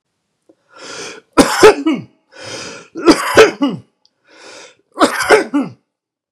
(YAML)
three_cough_length: 6.3 s
three_cough_amplitude: 32768
three_cough_signal_mean_std_ratio: 0.41
survey_phase: beta (2021-08-13 to 2022-03-07)
age: 45-64
gender: Male
wearing_mask: 'No'
symptom_none: true
smoker_status: Never smoked
respiratory_condition_asthma: false
respiratory_condition_other: false
recruitment_source: REACT
submission_delay: 1 day
covid_test_result: Negative
covid_test_method: RT-qPCR
influenza_a_test_result: Negative
influenza_b_test_result: Negative